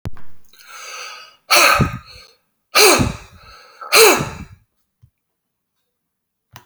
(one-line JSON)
{"exhalation_length": "6.7 s", "exhalation_amplitude": 32768, "exhalation_signal_mean_std_ratio": 0.39, "survey_phase": "beta (2021-08-13 to 2022-03-07)", "age": "65+", "gender": "Male", "wearing_mask": "No", "symptom_none": true, "smoker_status": "Never smoked", "respiratory_condition_asthma": false, "respiratory_condition_other": false, "recruitment_source": "REACT", "submission_delay": "1 day", "covid_test_result": "Negative", "covid_test_method": "RT-qPCR"}